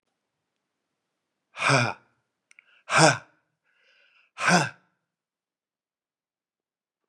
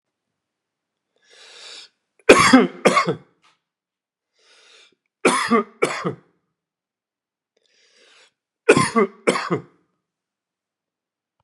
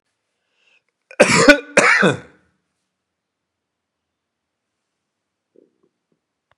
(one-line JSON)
{"exhalation_length": "7.1 s", "exhalation_amplitude": 29403, "exhalation_signal_mean_std_ratio": 0.26, "three_cough_length": "11.4 s", "three_cough_amplitude": 32768, "three_cough_signal_mean_std_ratio": 0.29, "cough_length": "6.6 s", "cough_amplitude": 32768, "cough_signal_mean_std_ratio": 0.26, "survey_phase": "beta (2021-08-13 to 2022-03-07)", "age": "65+", "gender": "Male", "wearing_mask": "No", "symptom_none": true, "smoker_status": "Never smoked", "respiratory_condition_asthma": false, "respiratory_condition_other": false, "recruitment_source": "REACT", "submission_delay": "1 day", "covid_test_result": "Negative", "covid_test_method": "RT-qPCR", "influenza_a_test_result": "Negative", "influenza_b_test_result": "Negative"}